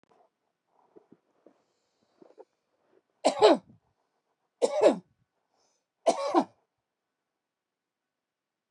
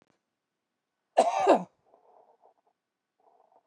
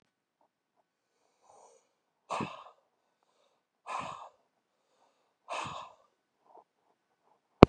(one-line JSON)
{"three_cough_length": "8.7 s", "three_cough_amplitude": 17052, "three_cough_signal_mean_std_ratio": 0.23, "cough_length": "3.7 s", "cough_amplitude": 14484, "cough_signal_mean_std_ratio": 0.25, "exhalation_length": "7.7 s", "exhalation_amplitude": 32768, "exhalation_signal_mean_std_ratio": 0.1, "survey_phase": "beta (2021-08-13 to 2022-03-07)", "age": "65+", "gender": "Male", "wearing_mask": "No", "symptom_none": true, "smoker_status": "Ex-smoker", "respiratory_condition_asthma": false, "respiratory_condition_other": false, "recruitment_source": "REACT", "submission_delay": "2 days", "covid_test_result": "Negative", "covid_test_method": "RT-qPCR"}